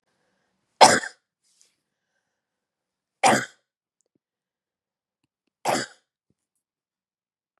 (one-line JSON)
{"three_cough_length": "7.6 s", "three_cough_amplitude": 32766, "three_cough_signal_mean_std_ratio": 0.19, "survey_phase": "beta (2021-08-13 to 2022-03-07)", "age": "45-64", "gender": "Female", "wearing_mask": "No", "symptom_none": true, "smoker_status": "Ex-smoker", "respiratory_condition_asthma": false, "respiratory_condition_other": false, "recruitment_source": "REACT", "submission_delay": "1 day", "covid_test_result": "Negative", "covid_test_method": "RT-qPCR", "influenza_a_test_result": "Negative", "influenza_b_test_result": "Negative"}